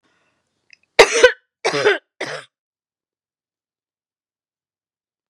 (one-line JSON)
{"cough_length": "5.3 s", "cough_amplitude": 32768, "cough_signal_mean_std_ratio": 0.24, "survey_phase": "beta (2021-08-13 to 2022-03-07)", "age": "45-64", "gender": "Female", "wearing_mask": "No", "symptom_none": true, "smoker_status": "Never smoked", "respiratory_condition_asthma": false, "respiratory_condition_other": false, "recruitment_source": "REACT", "submission_delay": "2 days", "covid_test_result": "Negative", "covid_test_method": "RT-qPCR", "influenza_a_test_result": "Negative", "influenza_b_test_result": "Negative"}